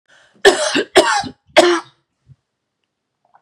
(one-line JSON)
{"three_cough_length": "3.4 s", "three_cough_amplitude": 32768, "three_cough_signal_mean_std_ratio": 0.38, "survey_phase": "beta (2021-08-13 to 2022-03-07)", "age": "18-44", "gender": "Female", "wearing_mask": "No", "symptom_none": true, "smoker_status": "Ex-smoker", "respiratory_condition_asthma": false, "respiratory_condition_other": false, "recruitment_source": "REACT", "submission_delay": "1 day", "covid_test_result": "Negative", "covid_test_method": "RT-qPCR", "influenza_a_test_result": "Negative", "influenza_b_test_result": "Negative"}